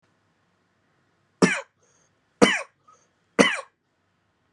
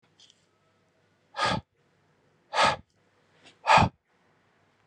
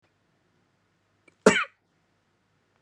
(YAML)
three_cough_length: 4.5 s
three_cough_amplitude: 32767
three_cough_signal_mean_std_ratio: 0.24
exhalation_length: 4.9 s
exhalation_amplitude: 15353
exhalation_signal_mean_std_ratio: 0.28
cough_length: 2.8 s
cough_amplitude: 25005
cough_signal_mean_std_ratio: 0.17
survey_phase: beta (2021-08-13 to 2022-03-07)
age: 18-44
gender: Male
wearing_mask: 'No'
symptom_none: true
smoker_status: Current smoker (e-cigarettes or vapes only)
respiratory_condition_asthma: false
respiratory_condition_other: false
recruitment_source: REACT
submission_delay: 1 day
covid_test_result: Negative
covid_test_method: RT-qPCR